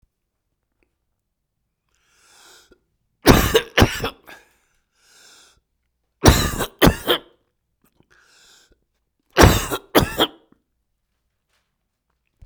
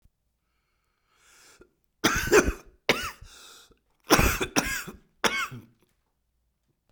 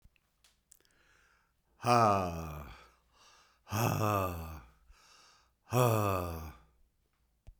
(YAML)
three_cough_length: 12.5 s
three_cough_amplitude: 32768
three_cough_signal_mean_std_ratio: 0.26
cough_length: 6.9 s
cough_amplitude: 26935
cough_signal_mean_std_ratio: 0.34
exhalation_length: 7.6 s
exhalation_amplitude: 8303
exhalation_signal_mean_std_ratio: 0.42
survey_phase: beta (2021-08-13 to 2022-03-07)
age: 65+
gender: Male
wearing_mask: 'No'
symptom_cough_any: true
symptom_runny_or_blocked_nose: true
symptom_shortness_of_breath: true
symptom_fatigue: true
symptom_change_to_sense_of_smell_or_taste: true
symptom_loss_of_taste: true
symptom_onset: 9 days
smoker_status: Ex-smoker
respiratory_condition_asthma: false
respiratory_condition_other: false
recruitment_source: Test and Trace
submission_delay: 3 days
covid_test_result: Positive
covid_test_method: RT-qPCR
covid_ct_value: 21.7
covid_ct_gene: ORF1ab gene
covid_ct_mean: 22.2
covid_viral_load: 54000 copies/ml
covid_viral_load_category: Low viral load (10K-1M copies/ml)